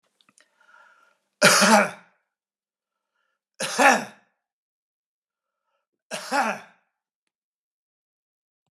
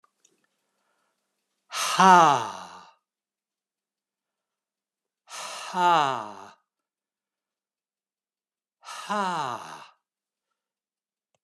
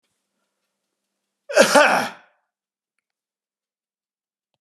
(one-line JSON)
{"three_cough_length": "8.7 s", "three_cough_amplitude": 31692, "three_cough_signal_mean_std_ratio": 0.27, "exhalation_length": "11.4 s", "exhalation_amplitude": 24930, "exhalation_signal_mean_std_ratio": 0.26, "cough_length": "4.6 s", "cough_amplitude": 32767, "cough_signal_mean_std_ratio": 0.25, "survey_phase": "beta (2021-08-13 to 2022-03-07)", "age": "65+", "gender": "Male", "wearing_mask": "No", "symptom_none": true, "smoker_status": "Never smoked", "respiratory_condition_asthma": false, "respiratory_condition_other": false, "recruitment_source": "REACT", "submission_delay": "2 days", "covid_test_result": "Negative", "covid_test_method": "RT-qPCR"}